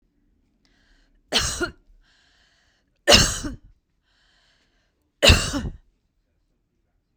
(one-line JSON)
{"three_cough_length": "7.2 s", "three_cough_amplitude": 32768, "three_cough_signal_mean_std_ratio": 0.27, "survey_phase": "beta (2021-08-13 to 2022-03-07)", "age": "65+", "gender": "Female", "wearing_mask": "No", "symptom_none": true, "smoker_status": "Never smoked", "respiratory_condition_asthma": false, "respiratory_condition_other": false, "recruitment_source": "REACT", "submission_delay": "2 days", "covid_test_result": "Negative", "covid_test_method": "RT-qPCR", "influenza_a_test_result": "Negative", "influenza_b_test_result": "Negative"}